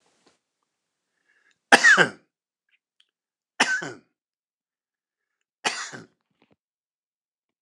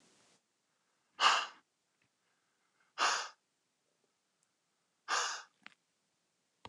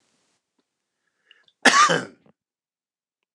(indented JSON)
{
  "three_cough_length": "7.6 s",
  "three_cough_amplitude": 29204,
  "three_cough_signal_mean_std_ratio": 0.21,
  "exhalation_length": "6.7 s",
  "exhalation_amplitude": 6366,
  "exhalation_signal_mean_std_ratio": 0.27,
  "cough_length": "3.3 s",
  "cough_amplitude": 29203,
  "cough_signal_mean_std_ratio": 0.25,
  "survey_phase": "beta (2021-08-13 to 2022-03-07)",
  "age": "65+",
  "gender": "Male",
  "wearing_mask": "No",
  "symptom_headache": true,
  "smoker_status": "Ex-smoker",
  "respiratory_condition_asthma": false,
  "respiratory_condition_other": false,
  "recruitment_source": "REACT",
  "submission_delay": "1 day",
  "covid_test_result": "Negative",
  "covid_test_method": "RT-qPCR"
}